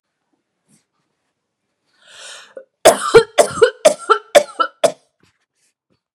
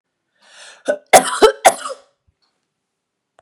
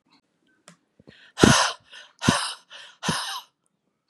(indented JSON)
{
  "three_cough_length": "6.1 s",
  "three_cough_amplitude": 32768,
  "three_cough_signal_mean_std_ratio": 0.29,
  "cough_length": "3.4 s",
  "cough_amplitude": 32768,
  "cough_signal_mean_std_ratio": 0.28,
  "exhalation_length": "4.1 s",
  "exhalation_amplitude": 32768,
  "exhalation_signal_mean_std_ratio": 0.32,
  "survey_phase": "beta (2021-08-13 to 2022-03-07)",
  "age": "18-44",
  "gender": "Female",
  "wearing_mask": "No",
  "symptom_none": true,
  "smoker_status": "Never smoked",
  "respiratory_condition_asthma": false,
  "respiratory_condition_other": false,
  "recruitment_source": "REACT",
  "submission_delay": "8 days",
  "covid_test_result": "Negative",
  "covid_test_method": "RT-qPCR",
  "influenza_a_test_result": "Negative",
  "influenza_b_test_result": "Negative"
}